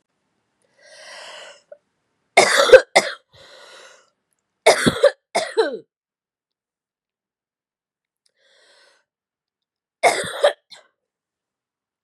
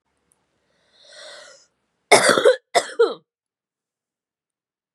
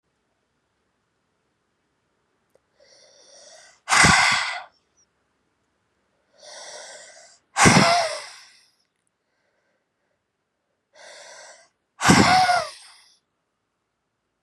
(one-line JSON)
{"three_cough_length": "12.0 s", "three_cough_amplitude": 32768, "three_cough_signal_mean_std_ratio": 0.25, "cough_length": "4.9 s", "cough_amplitude": 32768, "cough_signal_mean_std_ratio": 0.27, "exhalation_length": "14.4 s", "exhalation_amplitude": 29219, "exhalation_signal_mean_std_ratio": 0.3, "survey_phase": "beta (2021-08-13 to 2022-03-07)", "age": "18-44", "gender": "Female", "wearing_mask": "No", "symptom_none": true, "smoker_status": "Never smoked", "respiratory_condition_asthma": true, "respiratory_condition_other": false, "recruitment_source": "REACT", "submission_delay": "1 day", "covid_test_result": "Negative", "covid_test_method": "RT-qPCR", "influenza_a_test_result": "Negative", "influenza_b_test_result": "Negative"}